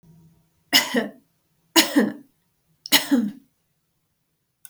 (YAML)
three_cough_length: 4.7 s
three_cough_amplitude: 32460
three_cough_signal_mean_std_ratio: 0.34
survey_phase: beta (2021-08-13 to 2022-03-07)
age: 65+
gender: Female
wearing_mask: 'No'
symptom_none: true
smoker_status: Never smoked
respiratory_condition_asthma: false
respiratory_condition_other: false
recruitment_source: REACT
submission_delay: 2 days
covid_test_result: Negative
covid_test_method: RT-qPCR
influenza_a_test_result: Negative
influenza_b_test_result: Negative